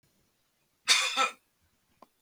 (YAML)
cough_length: 2.2 s
cough_amplitude: 13638
cough_signal_mean_std_ratio: 0.33
survey_phase: beta (2021-08-13 to 2022-03-07)
age: 65+
gender: Male
wearing_mask: 'No'
symptom_runny_or_blocked_nose: true
smoker_status: Never smoked
respiratory_condition_asthma: false
respiratory_condition_other: false
recruitment_source: REACT
submission_delay: 2 days
covid_test_result: Negative
covid_test_method: RT-qPCR
influenza_a_test_result: Negative
influenza_b_test_result: Negative